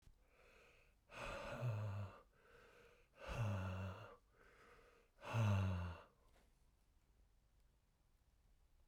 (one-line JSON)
{"exhalation_length": "8.9 s", "exhalation_amplitude": 1168, "exhalation_signal_mean_std_ratio": 0.48, "survey_phase": "beta (2021-08-13 to 2022-03-07)", "age": "45-64", "gender": "Male", "wearing_mask": "No", "symptom_none": true, "smoker_status": "Ex-smoker", "respiratory_condition_asthma": false, "respiratory_condition_other": false, "recruitment_source": "REACT", "submission_delay": "2 days", "covid_test_result": "Negative", "covid_test_method": "RT-qPCR"}